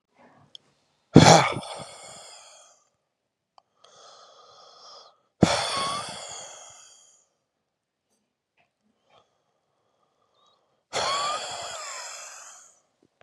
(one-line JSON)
{"exhalation_length": "13.2 s", "exhalation_amplitude": 32768, "exhalation_signal_mean_std_ratio": 0.24, "survey_phase": "beta (2021-08-13 to 2022-03-07)", "age": "18-44", "gender": "Male", "wearing_mask": "No", "symptom_cough_any": true, "symptom_runny_or_blocked_nose": true, "symptom_shortness_of_breath": true, "symptom_fatigue": true, "symptom_fever_high_temperature": true, "symptom_change_to_sense_of_smell_or_taste": true, "smoker_status": "Never smoked", "respiratory_condition_asthma": true, "respiratory_condition_other": false, "recruitment_source": "Test and Trace", "submission_delay": "2 days", "covid_test_result": "Positive", "covid_test_method": "LFT"}